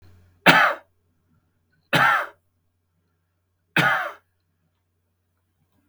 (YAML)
three_cough_length: 5.9 s
three_cough_amplitude: 32768
three_cough_signal_mean_std_ratio: 0.31
survey_phase: beta (2021-08-13 to 2022-03-07)
age: 65+
gender: Male
wearing_mask: 'No'
symptom_none: true
smoker_status: Ex-smoker
respiratory_condition_asthma: false
respiratory_condition_other: true
recruitment_source: REACT
submission_delay: 4 days
covid_test_result: Negative
covid_test_method: RT-qPCR